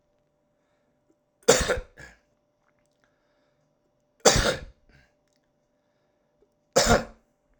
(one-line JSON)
{"three_cough_length": "7.6 s", "three_cough_amplitude": 30771, "three_cough_signal_mean_std_ratio": 0.26, "survey_phase": "alpha (2021-03-01 to 2021-08-12)", "age": "45-64", "gender": "Male", "wearing_mask": "No", "symptom_none": true, "smoker_status": "Current smoker (1 to 10 cigarettes per day)", "respiratory_condition_asthma": false, "respiratory_condition_other": false, "recruitment_source": "REACT", "submission_delay": "1 day", "covid_test_result": "Negative", "covid_test_method": "RT-qPCR"}